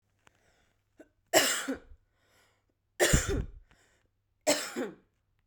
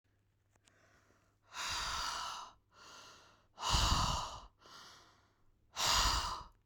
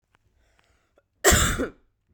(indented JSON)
{
  "three_cough_length": "5.5 s",
  "three_cough_amplitude": 15666,
  "three_cough_signal_mean_std_ratio": 0.35,
  "exhalation_length": "6.7 s",
  "exhalation_amplitude": 4606,
  "exhalation_signal_mean_std_ratio": 0.49,
  "cough_length": "2.1 s",
  "cough_amplitude": 26411,
  "cough_signal_mean_std_ratio": 0.34,
  "survey_phase": "beta (2021-08-13 to 2022-03-07)",
  "age": "18-44",
  "gender": "Female",
  "wearing_mask": "No",
  "symptom_cough_any": true,
  "symptom_runny_or_blocked_nose": true,
  "symptom_other": true,
  "symptom_onset": "3 days",
  "smoker_status": "Ex-smoker",
  "respiratory_condition_asthma": false,
  "respiratory_condition_other": false,
  "recruitment_source": "Test and Trace",
  "submission_delay": "1 day",
  "covid_test_result": "Positive",
  "covid_test_method": "RT-qPCR",
  "covid_ct_value": 20.9,
  "covid_ct_gene": "ORF1ab gene",
  "covid_ct_mean": 21.8,
  "covid_viral_load": "70000 copies/ml",
  "covid_viral_load_category": "Low viral load (10K-1M copies/ml)"
}